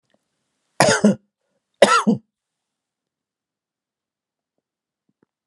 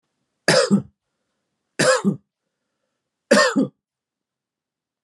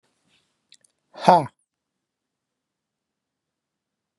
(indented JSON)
{
  "cough_length": "5.5 s",
  "cough_amplitude": 32768,
  "cough_signal_mean_std_ratio": 0.26,
  "three_cough_length": "5.0 s",
  "three_cough_amplitude": 25835,
  "three_cough_signal_mean_std_ratio": 0.35,
  "exhalation_length": "4.2 s",
  "exhalation_amplitude": 32767,
  "exhalation_signal_mean_std_ratio": 0.15,
  "survey_phase": "beta (2021-08-13 to 2022-03-07)",
  "age": "45-64",
  "gender": "Male",
  "wearing_mask": "No",
  "symptom_none": true,
  "smoker_status": "Ex-smoker",
  "respiratory_condition_asthma": false,
  "respiratory_condition_other": false,
  "recruitment_source": "REACT",
  "submission_delay": "1 day",
  "covid_test_result": "Negative",
  "covid_test_method": "RT-qPCR"
}